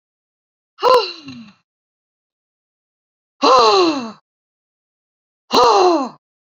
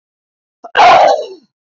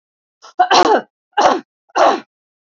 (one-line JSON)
{"exhalation_length": "6.6 s", "exhalation_amplitude": 30770, "exhalation_signal_mean_std_ratio": 0.38, "cough_length": "1.7 s", "cough_amplitude": 28135, "cough_signal_mean_std_ratio": 0.49, "three_cough_length": "2.6 s", "three_cough_amplitude": 29420, "three_cough_signal_mean_std_ratio": 0.46, "survey_phase": "beta (2021-08-13 to 2022-03-07)", "age": "18-44", "gender": "Female", "wearing_mask": "No", "symptom_diarrhoea": true, "smoker_status": "Never smoked", "respiratory_condition_asthma": false, "respiratory_condition_other": false, "recruitment_source": "REACT", "submission_delay": "5 days", "covid_test_result": "Negative", "covid_test_method": "RT-qPCR", "influenza_a_test_result": "Unknown/Void", "influenza_b_test_result": "Unknown/Void"}